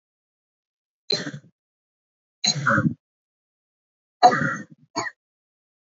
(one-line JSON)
{"three_cough_length": "5.8 s", "three_cough_amplitude": 27282, "three_cough_signal_mean_std_ratio": 0.3, "survey_phase": "alpha (2021-03-01 to 2021-08-12)", "age": "18-44", "gender": "Female", "wearing_mask": "No", "symptom_cough_any": true, "symptom_fatigue": true, "symptom_headache": true, "symptom_onset": "3 days", "smoker_status": "Never smoked", "respiratory_condition_asthma": false, "respiratory_condition_other": false, "recruitment_source": "Test and Trace", "submission_delay": "1 day", "covid_test_result": "Positive", "covid_test_method": "RT-qPCR"}